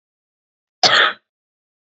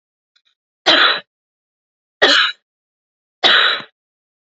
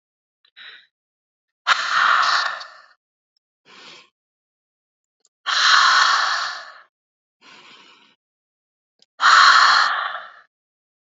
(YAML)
cough_length: 2.0 s
cough_amplitude: 32768
cough_signal_mean_std_ratio: 0.3
three_cough_length: 4.5 s
three_cough_amplitude: 32768
three_cough_signal_mean_std_ratio: 0.38
exhalation_length: 11.1 s
exhalation_amplitude: 29808
exhalation_signal_mean_std_ratio: 0.41
survey_phase: beta (2021-08-13 to 2022-03-07)
age: 18-44
gender: Female
wearing_mask: 'No'
symptom_cough_any: true
symptom_runny_or_blocked_nose: true
symptom_sore_throat: true
symptom_fatigue: true
symptom_fever_high_temperature: true
symptom_headache: true
symptom_other: true
symptom_onset: 3 days
smoker_status: Never smoked
respiratory_condition_asthma: false
respiratory_condition_other: false
recruitment_source: Test and Trace
submission_delay: 2 days
covid_test_result: Positive
covid_test_method: RT-qPCR
covid_ct_value: 20.6
covid_ct_gene: ORF1ab gene